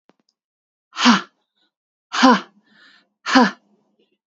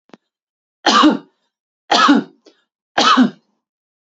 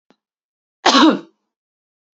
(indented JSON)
{
  "exhalation_length": "4.3 s",
  "exhalation_amplitude": 28677,
  "exhalation_signal_mean_std_ratio": 0.31,
  "three_cough_length": "4.1 s",
  "three_cough_amplitude": 31942,
  "three_cough_signal_mean_std_ratio": 0.41,
  "cough_length": "2.1 s",
  "cough_amplitude": 29084,
  "cough_signal_mean_std_ratio": 0.31,
  "survey_phase": "beta (2021-08-13 to 2022-03-07)",
  "age": "45-64",
  "gender": "Female",
  "wearing_mask": "No",
  "symptom_none": true,
  "smoker_status": "Never smoked",
  "respiratory_condition_asthma": false,
  "respiratory_condition_other": false,
  "recruitment_source": "REACT",
  "submission_delay": "1 day",
  "covid_test_result": "Negative",
  "covid_test_method": "RT-qPCR",
  "influenza_a_test_result": "Unknown/Void",
  "influenza_b_test_result": "Unknown/Void"
}